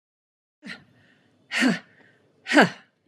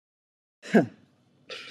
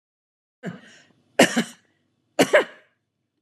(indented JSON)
{
  "exhalation_length": "3.1 s",
  "exhalation_amplitude": 30913,
  "exhalation_signal_mean_std_ratio": 0.29,
  "cough_length": "1.7 s",
  "cough_amplitude": 15784,
  "cough_signal_mean_std_ratio": 0.24,
  "three_cough_length": "3.4 s",
  "three_cough_amplitude": 25324,
  "three_cough_signal_mean_std_ratio": 0.27,
  "survey_phase": "beta (2021-08-13 to 2022-03-07)",
  "age": "65+",
  "gender": "Female",
  "wearing_mask": "No",
  "symptom_none": true,
  "smoker_status": "Never smoked",
  "respiratory_condition_asthma": false,
  "respiratory_condition_other": false,
  "recruitment_source": "REACT",
  "submission_delay": "4 days",
  "covid_test_result": "Negative",
  "covid_test_method": "RT-qPCR"
}